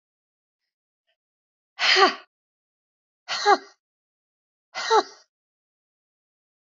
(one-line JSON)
{"exhalation_length": "6.7 s", "exhalation_amplitude": 25145, "exhalation_signal_mean_std_ratio": 0.25, "survey_phase": "beta (2021-08-13 to 2022-03-07)", "age": "65+", "gender": "Female", "wearing_mask": "No", "symptom_none": true, "smoker_status": "Ex-smoker", "respiratory_condition_asthma": false, "respiratory_condition_other": false, "recruitment_source": "REACT", "submission_delay": "1 day", "covid_test_result": "Negative", "covid_test_method": "RT-qPCR", "influenza_a_test_result": "Negative", "influenza_b_test_result": "Negative"}